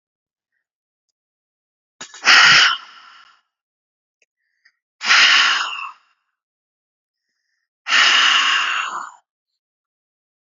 {"exhalation_length": "10.5 s", "exhalation_amplitude": 32768, "exhalation_signal_mean_std_ratio": 0.37, "survey_phase": "beta (2021-08-13 to 2022-03-07)", "age": "18-44", "gender": "Female", "wearing_mask": "No", "symptom_cough_any": true, "symptom_fatigue": true, "symptom_headache": true, "symptom_other": true, "smoker_status": "Never smoked", "respiratory_condition_asthma": false, "respiratory_condition_other": false, "recruitment_source": "Test and Trace", "submission_delay": "2 days", "covid_test_result": "Positive", "covid_test_method": "RT-qPCR", "covid_ct_value": 33.7, "covid_ct_gene": "ORF1ab gene", "covid_ct_mean": 34.6, "covid_viral_load": "4.5 copies/ml", "covid_viral_load_category": "Minimal viral load (< 10K copies/ml)"}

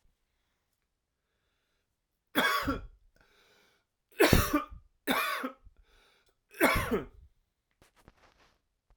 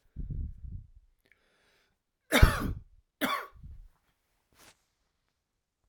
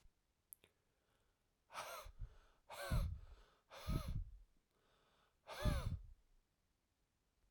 {"three_cough_length": "9.0 s", "three_cough_amplitude": 15779, "three_cough_signal_mean_std_ratio": 0.33, "cough_length": "5.9 s", "cough_amplitude": 19306, "cough_signal_mean_std_ratio": 0.26, "exhalation_length": "7.5 s", "exhalation_amplitude": 1503, "exhalation_signal_mean_std_ratio": 0.4, "survey_phase": "alpha (2021-03-01 to 2021-08-12)", "age": "45-64", "gender": "Male", "wearing_mask": "No", "symptom_none": true, "smoker_status": "Ex-smoker", "respiratory_condition_asthma": false, "respiratory_condition_other": false, "recruitment_source": "REACT", "submission_delay": "1 day", "covid_test_result": "Negative", "covid_test_method": "RT-qPCR"}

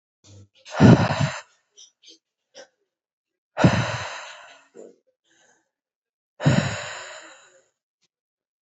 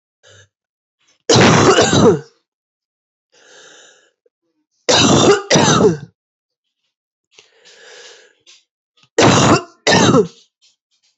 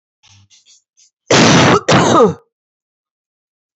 {"exhalation_length": "8.6 s", "exhalation_amplitude": 29953, "exhalation_signal_mean_std_ratio": 0.29, "three_cough_length": "11.2 s", "three_cough_amplitude": 32474, "three_cough_signal_mean_std_ratio": 0.43, "cough_length": "3.8 s", "cough_amplitude": 31484, "cough_signal_mean_std_ratio": 0.45, "survey_phase": "beta (2021-08-13 to 2022-03-07)", "age": "18-44", "gender": "Female", "wearing_mask": "No", "symptom_cough_any": true, "symptom_runny_or_blocked_nose": true, "symptom_sore_throat": true, "symptom_abdominal_pain": true, "symptom_fatigue": true, "symptom_headache": true, "symptom_onset": "3 days", "smoker_status": "Current smoker (e-cigarettes or vapes only)", "respiratory_condition_asthma": false, "respiratory_condition_other": false, "recruitment_source": "Test and Trace", "submission_delay": "2 days", "covid_test_result": "Positive", "covid_test_method": "RT-qPCR", "covid_ct_value": 16.5, "covid_ct_gene": "ORF1ab gene", "covid_ct_mean": 16.9, "covid_viral_load": "2900000 copies/ml", "covid_viral_load_category": "High viral load (>1M copies/ml)"}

